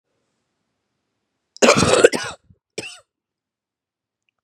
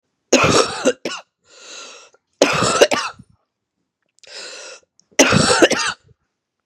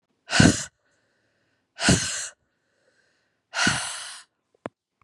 {"cough_length": "4.4 s", "cough_amplitude": 32768, "cough_signal_mean_std_ratio": 0.26, "three_cough_length": "6.7 s", "three_cough_amplitude": 32768, "three_cough_signal_mean_std_ratio": 0.43, "exhalation_length": "5.0 s", "exhalation_amplitude": 28718, "exhalation_signal_mean_std_ratio": 0.33, "survey_phase": "beta (2021-08-13 to 2022-03-07)", "age": "45-64", "gender": "Female", "wearing_mask": "No", "symptom_cough_any": true, "symptom_sore_throat": true, "symptom_fatigue": true, "symptom_onset": "3 days", "smoker_status": "Never smoked", "respiratory_condition_asthma": false, "respiratory_condition_other": false, "recruitment_source": "Test and Trace", "submission_delay": "1 day", "covid_test_result": "Positive", "covid_test_method": "RT-qPCR", "covid_ct_value": 17.9, "covid_ct_gene": "ORF1ab gene", "covid_ct_mean": 18.4, "covid_viral_load": "940000 copies/ml", "covid_viral_load_category": "Low viral load (10K-1M copies/ml)"}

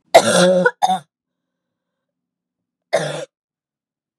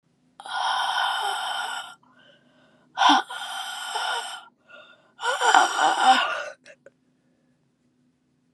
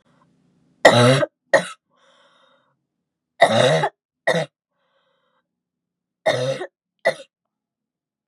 {"cough_length": "4.2 s", "cough_amplitude": 32768, "cough_signal_mean_std_ratio": 0.35, "exhalation_length": "8.5 s", "exhalation_amplitude": 31897, "exhalation_signal_mean_std_ratio": 0.49, "three_cough_length": "8.3 s", "three_cough_amplitude": 32768, "three_cough_signal_mean_std_ratio": 0.32, "survey_phase": "beta (2021-08-13 to 2022-03-07)", "age": "18-44", "gender": "Female", "wearing_mask": "Yes", "symptom_cough_any": true, "symptom_new_continuous_cough": true, "symptom_runny_or_blocked_nose": true, "symptom_sore_throat": true, "symptom_abdominal_pain": true, "symptom_fever_high_temperature": true, "symptom_headache": true, "smoker_status": "Never smoked", "respiratory_condition_asthma": false, "respiratory_condition_other": false, "recruitment_source": "Test and Trace", "submission_delay": "1 day", "covid_test_result": "Positive", "covid_test_method": "LFT"}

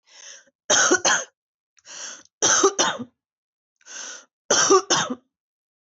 {"three_cough_length": "5.8 s", "three_cough_amplitude": 18695, "three_cough_signal_mean_std_ratio": 0.43, "survey_phase": "beta (2021-08-13 to 2022-03-07)", "age": "18-44", "gender": "Female", "wearing_mask": "No", "symptom_cough_any": true, "symptom_runny_or_blocked_nose": true, "symptom_sore_throat": true, "symptom_change_to_sense_of_smell_or_taste": true, "symptom_onset": "4 days", "smoker_status": "Never smoked", "respiratory_condition_asthma": true, "respiratory_condition_other": false, "recruitment_source": "REACT", "submission_delay": "1 day", "covid_test_result": "Negative", "covid_test_method": "RT-qPCR", "influenza_a_test_result": "Negative", "influenza_b_test_result": "Negative"}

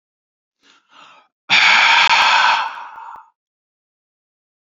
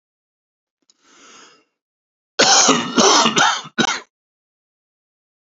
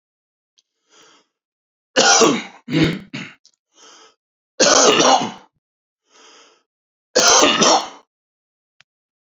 {"exhalation_length": "4.7 s", "exhalation_amplitude": 30119, "exhalation_signal_mean_std_ratio": 0.44, "cough_length": "5.5 s", "cough_amplitude": 32768, "cough_signal_mean_std_ratio": 0.39, "three_cough_length": "9.3 s", "three_cough_amplitude": 32768, "three_cough_signal_mean_std_ratio": 0.4, "survey_phase": "alpha (2021-03-01 to 2021-08-12)", "age": "45-64", "gender": "Male", "wearing_mask": "No", "symptom_none": true, "smoker_status": "Never smoked", "respiratory_condition_asthma": false, "respiratory_condition_other": false, "recruitment_source": "REACT", "submission_delay": "4 days", "covid_test_result": "Negative", "covid_test_method": "RT-qPCR"}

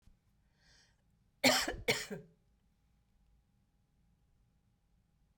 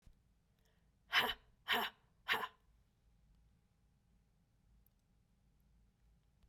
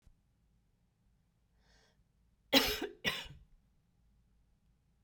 {"cough_length": "5.4 s", "cough_amplitude": 6331, "cough_signal_mean_std_ratio": 0.24, "exhalation_length": "6.5 s", "exhalation_amplitude": 3211, "exhalation_signal_mean_std_ratio": 0.26, "three_cough_length": "5.0 s", "three_cough_amplitude": 8474, "three_cough_signal_mean_std_ratio": 0.23, "survey_phase": "beta (2021-08-13 to 2022-03-07)", "age": "65+", "gender": "Female", "wearing_mask": "No", "symptom_cough_any": true, "symptom_runny_or_blocked_nose": true, "symptom_change_to_sense_of_smell_or_taste": true, "smoker_status": "Never smoked", "respiratory_condition_asthma": false, "respiratory_condition_other": false, "recruitment_source": "Test and Trace", "submission_delay": "2 days", "covid_test_result": "Positive", "covid_test_method": "LFT"}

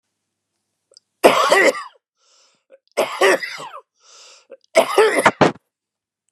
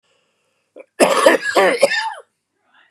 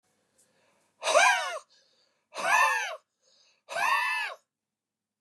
{"three_cough_length": "6.3 s", "three_cough_amplitude": 32768, "three_cough_signal_mean_std_ratio": 0.38, "cough_length": "2.9 s", "cough_amplitude": 32768, "cough_signal_mean_std_ratio": 0.46, "exhalation_length": "5.2 s", "exhalation_amplitude": 11726, "exhalation_signal_mean_std_ratio": 0.45, "survey_phase": "beta (2021-08-13 to 2022-03-07)", "age": "45-64", "gender": "Male", "wearing_mask": "No", "symptom_none": true, "smoker_status": "Ex-smoker", "respiratory_condition_asthma": false, "respiratory_condition_other": false, "recruitment_source": "REACT", "submission_delay": "1 day", "covid_test_result": "Negative", "covid_test_method": "RT-qPCR", "influenza_a_test_result": "Negative", "influenza_b_test_result": "Negative"}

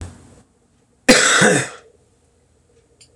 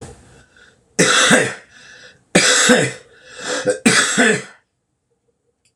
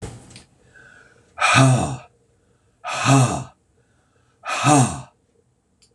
{"cough_length": "3.2 s", "cough_amplitude": 26028, "cough_signal_mean_std_ratio": 0.36, "three_cough_length": "5.8 s", "three_cough_amplitude": 26028, "three_cough_signal_mean_std_ratio": 0.49, "exhalation_length": "5.9 s", "exhalation_amplitude": 26027, "exhalation_signal_mean_std_ratio": 0.41, "survey_phase": "beta (2021-08-13 to 2022-03-07)", "age": "65+", "gender": "Male", "wearing_mask": "No", "symptom_cough_any": true, "symptom_runny_or_blocked_nose": true, "symptom_sore_throat": true, "symptom_headache": true, "symptom_onset": "3 days", "smoker_status": "Never smoked", "respiratory_condition_asthma": false, "respiratory_condition_other": false, "recruitment_source": "Test and Trace", "submission_delay": "1 day", "covid_test_result": "Positive", "covid_test_method": "ePCR"}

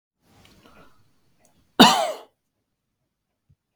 {"cough_length": "3.8 s", "cough_amplitude": 32768, "cough_signal_mean_std_ratio": 0.21, "survey_phase": "beta (2021-08-13 to 2022-03-07)", "age": "18-44", "gender": "Male", "wearing_mask": "No", "symptom_none": true, "smoker_status": "Never smoked", "respiratory_condition_asthma": false, "respiratory_condition_other": false, "recruitment_source": "REACT", "submission_delay": "4 days", "covid_test_result": "Negative", "covid_test_method": "RT-qPCR", "influenza_a_test_result": "Negative", "influenza_b_test_result": "Negative"}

